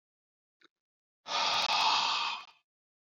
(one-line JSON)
{"exhalation_length": "3.1 s", "exhalation_amplitude": 5048, "exhalation_signal_mean_std_ratio": 0.52, "survey_phase": "beta (2021-08-13 to 2022-03-07)", "age": "18-44", "gender": "Male", "wearing_mask": "No", "symptom_none": true, "smoker_status": "Never smoked", "respiratory_condition_asthma": false, "respiratory_condition_other": false, "recruitment_source": "REACT", "submission_delay": "2 days", "covid_test_result": "Negative", "covid_test_method": "RT-qPCR", "influenza_a_test_result": "Negative", "influenza_b_test_result": "Negative"}